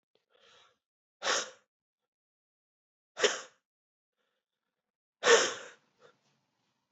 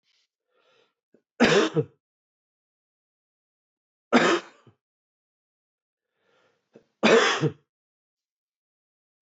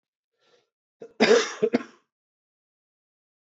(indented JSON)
{
  "exhalation_length": "6.9 s",
  "exhalation_amplitude": 10918,
  "exhalation_signal_mean_std_ratio": 0.23,
  "three_cough_length": "9.2 s",
  "three_cough_amplitude": 19468,
  "three_cough_signal_mean_std_ratio": 0.27,
  "cough_length": "3.4 s",
  "cough_amplitude": 17642,
  "cough_signal_mean_std_ratio": 0.27,
  "survey_phase": "beta (2021-08-13 to 2022-03-07)",
  "age": "45-64",
  "gender": "Male",
  "wearing_mask": "No",
  "symptom_cough_any": true,
  "symptom_runny_or_blocked_nose": true,
  "symptom_fatigue": true,
  "symptom_headache": true,
  "symptom_change_to_sense_of_smell_or_taste": true,
  "symptom_loss_of_taste": true,
  "symptom_onset": "2 days",
  "smoker_status": "Never smoked",
  "respiratory_condition_asthma": false,
  "respiratory_condition_other": false,
  "recruitment_source": "Test and Trace",
  "submission_delay": "1 day",
  "covid_test_result": "Positive",
  "covid_test_method": "RT-qPCR",
  "covid_ct_value": 21.0,
  "covid_ct_gene": "S gene"
}